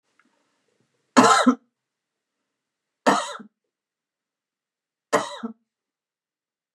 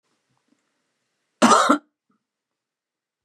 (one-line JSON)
{"three_cough_length": "6.7 s", "three_cough_amplitude": 29678, "three_cough_signal_mean_std_ratio": 0.25, "cough_length": "3.2 s", "cough_amplitude": 28129, "cough_signal_mean_std_ratio": 0.26, "survey_phase": "beta (2021-08-13 to 2022-03-07)", "age": "45-64", "gender": "Female", "wearing_mask": "No", "symptom_none": true, "symptom_onset": "12 days", "smoker_status": "Never smoked", "respiratory_condition_asthma": false, "respiratory_condition_other": false, "recruitment_source": "REACT", "submission_delay": "3 days", "covid_test_result": "Negative", "covid_test_method": "RT-qPCR", "influenza_a_test_result": "Unknown/Void", "influenza_b_test_result": "Unknown/Void"}